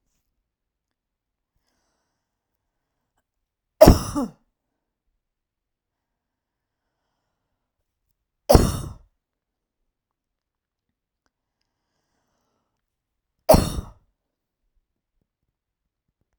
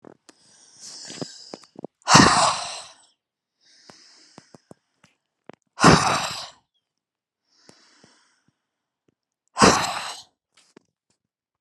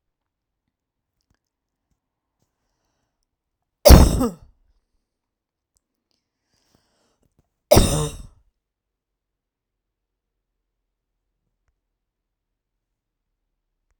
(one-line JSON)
{"three_cough_length": "16.4 s", "three_cough_amplitude": 32768, "three_cough_signal_mean_std_ratio": 0.15, "exhalation_length": "11.6 s", "exhalation_amplitude": 32767, "exhalation_signal_mean_std_ratio": 0.27, "cough_length": "14.0 s", "cough_amplitude": 32768, "cough_signal_mean_std_ratio": 0.16, "survey_phase": "alpha (2021-03-01 to 2021-08-12)", "age": "18-44", "gender": "Female", "wearing_mask": "No", "symptom_none": true, "smoker_status": "Ex-smoker", "respiratory_condition_asthma": false, "respiratory_condition_other": false, "recruitment_source": "REACT", "submission_delay": "2 days", "covid_test_result": "Negative", "covid_test_method": "RT-qPCR"}